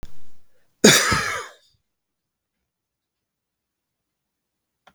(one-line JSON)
{"cough_length": "4.9 s", "cough_amplitude": 32768, "cough_signal_mean_std_ratio": 0.29, "survey_phase": "beta (2021-08-13 to 2022-03-07)", "age": "45-64", "gender": "Male", "wearing_mask": "No", "symptom_fatigue": true, "smoker_status": "Never smoked", "respiratory_condition_asthma": false, "respiratory_condition_other": false, "recruitment_source": "REACT", "submission_delay": "1 day", "covid_test_result": "Negative", "covid_test_method": "RT-qPCR"}